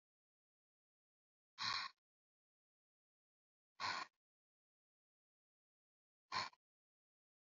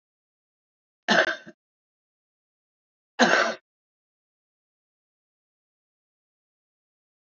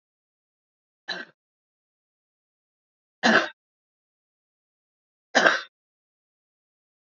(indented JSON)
{
  "exhalation_length": "7.4 s",
  "exhalation_amplitude": 1392,
  "exhalation_signal_mean_std_ratio": 0.23,
  "cough_length": "7.3 s",
  "cough_amplitude": 20272,
  "cough_signal_mean_std_ratio": 0.21,
  "three_cough_length": "7.2 s",
  "three_cough_amplitude": 28006,
  "three_cough_signal_mean_std_ratio": 0.2,
  "survey_phase": "alpha (2021-03-01 to 2021-08-12)",
  "age": "45-64",
  "gender": "Female",
  "wearing_mask": "No",
  "symptom_none": true,
  "smoker_status": "Current smoker (11 or more cigarettes per day)",
  "respiratory_condition_asthma": false,
  "respiratory_condition_other": false,
  "recruitment_source": "REACT",
  "submission_delay": "1 day",
  "covid_test_result": "Negative",
  "covid_test_method": "RT-qPCR"
}